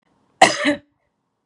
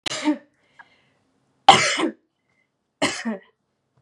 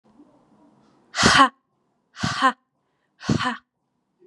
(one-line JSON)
{"cough_length": "1.5 s", "cough_amplitude": 32768, "cough_signal_mean_std_ratio": 0.31, "three_cough_length": "4.0 s", "three_cough_amplitude": 32768, "three_cough_signal_mean_std_ratio": 0.31, "exhalation_length": "4.3 s", "exhalation_amplitude": 29754, "exhalation_signal_mean_std_ratio": 0.33, "survey_phase": "beta (2021-08-13 to 2022-03-07)", "age": "18-44", "gender": "Female", "wearing_mask": "No", "symptom_none": true, "symptom_onset": "4 days", "smoker_status": "Never smoked", "respiratory_condition_asthma": false, "respiratory_condition_other": false, "recruitment_source": "REACT", "submission_delay": "1 day", "covid_test_result": "Negative", "covid_test_method": "RT-qPCR"}